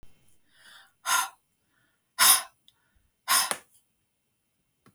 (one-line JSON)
{"exhalation_length": "4.9 s", "exhalation_amplitude": 16953, "exhalation_signal_mean_std_ratio": 0.28, "survey_phase": "beta (2021-08-13 to 2022-03-07)", "age": "65+", "gender": "Female", "wearing_mask": "No", "symptom_runny_or_blocked_nose": true, "smoker_status": "Never smoked", "respiratory_condition_asthma": false, "respiratory_condition_other": false, "recruitment_source": "REACT", "submission_delay": "2 days", "covid_test_result": "Negative", "covid_test_method": "RT-qPCR", "influenza_a_test_result": "Negative", "influenza_b_test_result": "Negative"}